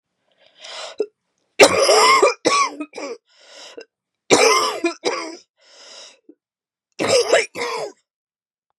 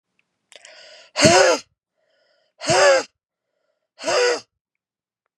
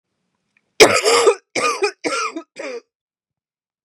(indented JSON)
{
  "three_cough_length": "8.8 s",
  "three_cough_amplitude": 32768,
  "three_cough_signal_mean_std_ratio": 0.43,
  "exhalation_length": "5.4 s",
  "exhalation_amplitude": 32696,
  "exhalation_signal_mean_std_ratio": 0.38,
  "cough_length": "3.8 s",
  "cough_amplitude": 32768,
  "cough_signal_mean_std_ratio": 0.41,
  "survey_phase": "beta (2021-08-13 to 2022-03-07)",
  "age": "18-44",
  "gender": "Female",
  "wearing_mask": "No",
  "symptom_cough_any": true,
  "symptom_runny_or_blocked_nose": true,
  "symptom_fatigue": true,
  "symptom_loss_of_taste": true,
  "symptom_onset": "4 days",
  "smoker_status": "Never smoked",
  "respiratory_condition_asthma": false,
  "respiratory_condition_other": false,
  "recruitment_source": "Test and Trace",
  "submission_delay": "1 day",
  "covid_test_result": "Positive",
  "covid_test_method": "RT-qPCR",
  "covid_ct_value": 23.5,
  "covid_ct_gene": "N gene"
}